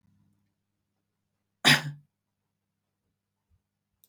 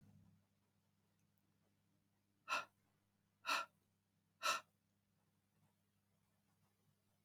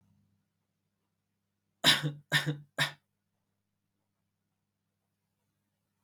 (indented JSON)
{
  "cough_length": "4.1 s",
  "cough_amplitude": 18573,
  "cough_signal_mean_std_ratio": 0.16,
  "exhalation_length": "7.2 s",
  "exhalation_amplitude": 1786,
  "exhalation_signal_mean_std_ratio": 0.23,
  "three_cough_length": "6.0 s",
  "three_cough_amplitude": 11673,
  "three_cough_signal_mean_std_ratio": 0.23,
  "survey_phase": "beta (2021-08-13 to 2022-03-07)",
  "age": "18-44",
  "gender": "Male",
  "wearing_mask": "No",
  "symptom_cough_any": true,
  "symptom_runny_or_blocked_nose": true,
  "smoker_status": "Never smoked",
  "respiratory_condition_asthma": false,
  "respiratory_condition_other": false,
  "recruitment_source": "REACT",
  "submission_delay": "0 days",
  "covid_test_result": "Negative",
  "covid_test_method": "RT-qPCR"
}